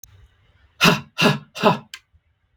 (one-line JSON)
{"exhalation_length": "2.6 s", "exhalation_amplitude": 32766, "exhalation_signal_mean_std_ratio": 0.36, "survey_phase": "beta (2021-08-13 to 2022-03-07)", "age": "18-44", "gender": "Male", "wearing_mask": "No", "symptom_none": true, "smoker_status": "Ex-smoker", "respiratory_condition_asthma": false, "respiratory_condition_other": false, "recruitment_source": "REACT", "submission_delay": "1 day", "covid_test_result": "Negative", "covid_test_method": "RT-qPCR", "influenza_a_test_result": "Negative", "influenza_b_test_result": "Negative"}